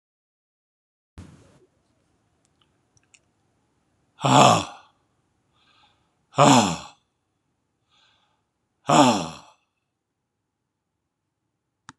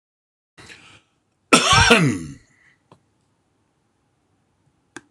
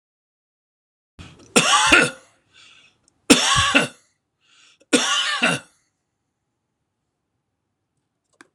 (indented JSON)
{
  "exhalation_length": "12.0 s",
  "exhalation_amplitude": 26028,
  "exhalation_signal_mean_std_ratio": 0.24,
  "cough_length": "5.1 s",
  "cough_amplitude": 26028,
  "cough_signal_mean_std_ratio": 0.29,
  "three_cough_length": "8.5 s",
  "three_cough_amplitude": 26028,
  "three_cough_signal_mean_std_ratio": 0.34,
  "survey_phase": "beta (2021-08-13 to 2022-03-07)",
  "age": "65+",
  "gender": "Male",
  "wearing_mask": "No",
  "symptom_none": true,
  "smoker_status": "Never smoked",
  "respiratory_condition_asthma": false,
  "respiratory_condition_other": false,
  "recruitment_source": "REACT",
  "submission_delay": "7 days",
  "covid_test_result": "Negative",
  "covid_test_method": "RT-qPCR",
  "influenza_a_test_result": "Negative",
  "influenza_b_test_result": "Negative"
}